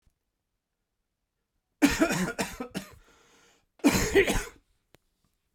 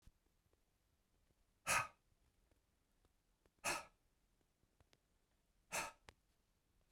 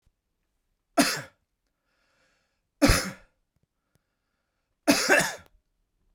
{
  "cough_length": "5.5 s",
  "cough_amplitude": 12336,
  "cough_signal_mean_std_ratio": 0.36,
  "exhalation_length": "6.9 s",
  "exhalation_amplitude": 1992,
  "exhalation_signal_mean_std_ratio": 0.24,
  "three_cough_length": "6.1 s",
  "three_cough_amplitude": 16265,
  "three_cough_signal_mean_std_ratio": 0.28,
  "survey_phase": "beta (2021-08-13 to 2022-03-07)",
  "age": "45-64",
  "gender": "Male",
  "wearing_mask": "No",
  "symptom_cough_any": true,
  "symptom_new_continuous_cough": true,
  "symptom_runny_or_blocked_nose": true,
  "symptom_fatigue": true,
  "symptom_fever_high_temperature": true,
  "symptom_headache": true,
  "symptom_onset": "4 days",
  "smoker_status": "Never smoked",
  "respiratory_condition_asthma": false,
  "respiratory_condition_other": false,
  "recruitment_source": "Test and Trace",
  "submission_delay": "2 days",
  "covid_test_result": "Positive",
  "covid_test_method": "RT-qPCR",
  "covid_ct_value": 13.9,
  "covid_ct_gene": "ORF1ab gene",
  "covid_ct_mean": 14.1,
  "covid_viral_load": "24000000 copies/ml",
  "covid_viral_load_category": "High viral load (>1M copies/ml)"
}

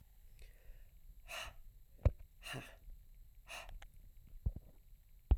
{
  "exhalation_length": "5.4 s",
  "exhalation_amplitude": 3993,
  "exhalation_signal_mean_std_ratio": 0.33,
  "survey_phase": "alpha (2021-03-01 to 2021-08-12)",
  "age": "18-44",
  "gender": "Female",
  "wearing_mask": "No",
  "symptom_cough_any": true,
  "symptom_fatigue": true,
  "symptom_fever_high_temperature": true,
  "symptom_headache": true,
  "smoker_status": "Never smoked",
  "respiratory_condition_asthma": true,
  "respiratory_condition_other": false,
  "recruitment_source": "Test and Trace",
  "submission_delay": "1 day",
  "covid_test_result": "Positive",
  "covid_test_method": "RT-qPCR"
}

